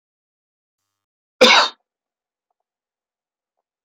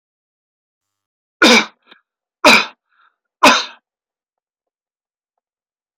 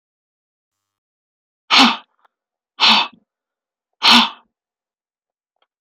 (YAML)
cough_length: 3.8 s
cough_amplitude: 29727
cough_signal_mean_std_ratio: 0.21
three_cough_length: 6.0 s
three_cough_amplitude: 32768
three_cough_signal_mean_std_ratio: 0.26
exhalation_length: 5.8 s
exhalation_amplitude: 31705
exhalation_signal_mean_std_ratio: 0.28
survey_phase: alpha (2021-03-01 to 2021-08-12)
age: 65+
gender: Male
wearing_mask: 'No'
symptom_none: true
smoker_status: Never smoked
respiratory_condition_asthma: false
respiratory_condition_other: false
recruitment_source: REACT
submission_delay: 2 days
covid_test_result: Negative
covid_test_method: RT-qPCR